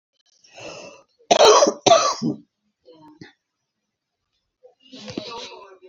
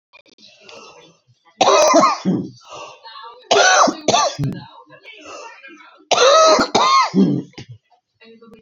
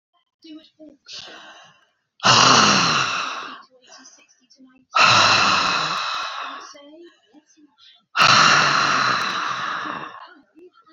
{"cough_length": "5.9 s", "cough_amplitude": 30266, "cough_signal_mean_std_ratio": 0.32, "three_cough_length": "8.6 s", "three_cough_amplitude": 32768, "three_cough_signal_mean_std_ratio": 0.52, "exhalation_length": "10.9 s", "exhalation_amplitude": 27451, "exhalation_signal_mean_std_ratio": 0.53, "survey_phase": "beta (2021-08-13 to 2022-03-07)", "age": "65+", "gender": "Female", "wearing_mask": "No", "symptom_cough_any": true, "symptom_shortness_of_breath": true, "smoker_status": "Ex-smoker", "respiratory_condition_asthma": true, "respiratory_condition_other": true, "recruitment_source": "REACT", "submission_delay": "2 days", "covid_test_result": "Negative", "covid_test_method": "RT-qPCR", "influenza_a_test_result": "Negative", "influenza_b_test_result": "Negative"}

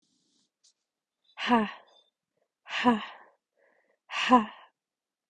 {"exhalation_length": "5.3 s", "exhalation_amplitude": 15208, "exhalation_signal_mean_std_ratio": 0.3, "survey_phase": "beta (2021-08-13 to 2022-03-07)", "age": "18-44", "gender": "Female", "wearing_mask": "No", "symptom_runny_or_blocked_nose": true, "symptom_sore_throat": true, "symptom_headache": true, "symptom_onset": "2 days", "smoker_status": "Never smoked", "respiratory_condition_asthma": false, "respiratory_condition_other": false, "recruitment_source": "Test and Trace", "submission_delay": "2 days", "covid_test_result": "Positive", "covid_test_method": "RT-qPCR", "covid_ct_value": 21.3, "covid_ct_gene": "N gene", "covid_ct_mean": 21.9, "covid_viral_load": "64000 copies/ml", "covid_viral_load_category": "Low viral load (10K-1M copies/ml)"}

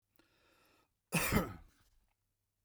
{"cough_length": "2.6 s", "cough_amplitude": 4230, "cough_signal_mean_std_ratio": 0.3, "survey_phase": "beta (2021-08-13 to 2022-03-07)", "age": "65+", "gender": "Male", "wearing_mask": "No", "symptom_none": true, "smoker_status": "Never smoked", "respiratory_condition_asthma": false, "respiratory_condition_other": false, "recruitment_source": "REACT", "submission_delay": "3 days", "covid_test_result": "Negative", "covid_test_method": "RT-qPCR", "influenza_a_test_result": "Negative", "influenza_b_test_result": "Negative"}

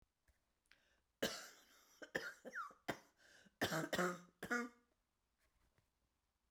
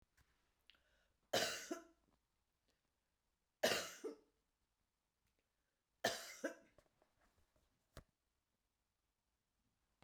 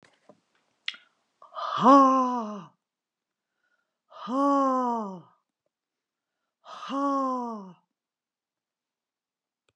{"cough_length": "6.5 s", "cough_amplitude": 1784, "cough_signal_mean_std_ratio": 0.37, "three_cough_length": "10.0 s", "three_cough_amplitude": 2133, "three_cough_signal_mean_std_ratio": 0.24, "exhalation_length": "9.8 s", "exhalation_amplitude": 16964, "exhalation_signal_mean_std_ratio": 0.37, "survey_phase": "beta (2021-08-13 to 2022-03-07)", "age": "65+", "gender": "Female", "wearing_mask": "No", "symptom_cough_any": true, "symptom_sore_throat": true, "symptom_headache": true, "symptom_onset": "6 days", "smoker_status": "Ex-smoker", "respiratory_condition_asthma": false, "respiratory_condition_other": false, "recruitment_source": "REACT", "submission_delay": "2 days", "covid_test_result": "Negative", "covid_test_method": "RT-qPCR", "influenza_a_test_result": "Negative", "influenza_b_test_result": "Negative"}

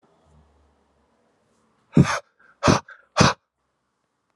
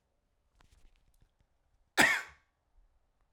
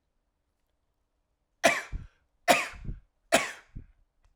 {"exhalation_length": "4.4 s", "exhalation_amplitude": 30389, "exhalation_signal_mean_std_ratio": 0.25, "cough_length": "3.3 s", "cough_amplitude": 11923, "cough_signal_mean_std_ratio": 0.21, "three_cough_length": "4.4 s", "three_cough_amplitude": 16825, "three_cough_signal_mean_std_ratio": 0.28, "survey_phase": "alpha (2021-03-01 to 2021-08-12)", "age": "45-64", "gender": "Male", "wearing_mask": "No", "symptom_none": true, "smoker_status": "Never smoked", "respiratory_condition_asthma": false, "respiratory_condition_other": false, "recruitment_source": "REACT", "submission_delay": "1 day", "covid_test_result": "Negative", "covid_test_method": "RT-qPCR"}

